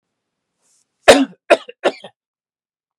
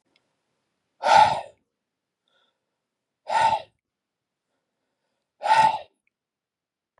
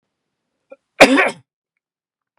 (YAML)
three_cough_length: 3.0 s
three_cough_amplitude: 32768
three_cough_signal_mean_std_ratio: 0.24
exhalation_length: 7.0 s
exhalation_amplitude: 21985
exhalation_signal_mean_std_ratio: 0.29
cough_length: 2.4 s
cough_amplitude: 32768
cough_signal_mean_std_ratio: 0.26
survey_phase: beta (2021-08-13 to 2022-03-07)
age: 45-64
gender: Male
wearing_mask: 'No'
symptom_none: true
smoker_status: Never smoked
respiratory_condition_asthma: false
respiratory_condition_other: false
recruitment_source: REACT
submission_delay: 1 day
covid_test_result: Negative
covid_test_method: RT-qPCR